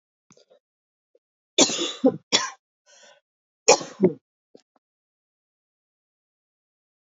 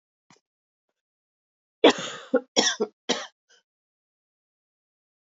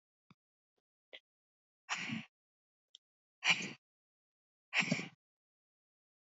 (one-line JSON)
{"three_cough_length": "7.1 s", "three_cough_amplitude": 29455, "three_cough_signal_mean_std_ratio": 0.23, "cough_length": "5.2 s", "cough_amplitude": 22729, "cough_signal_mean_std_ratio": 0.23, "exhalation_length": "6.2 s", "exhalation_amplitude": 5251, "exhalation_signal_mean_std_ratio": 0.26, "survey_phase": "alpha (2021-03-01 to 2021-08-12)", "age": "18-44", "gender": "Female", "wearing_mask": "No", "symptom_cough_any": true, "symptom_fatigue": true, "symptom_headache": true, "symptom_onset": "3 days", "smoker_status": "Never smoked", "respiratory_condition_asthma": false, "respiratory_condition_other": false, "recruitment_source": "Test and Trace", "submission_delay": "2 days", "covid_test_result": "Positive", "covid_test_method": "RT-qPCR", "covid_ct_value": 20.9, "covid_ct_gene": "ORF1ab gene"}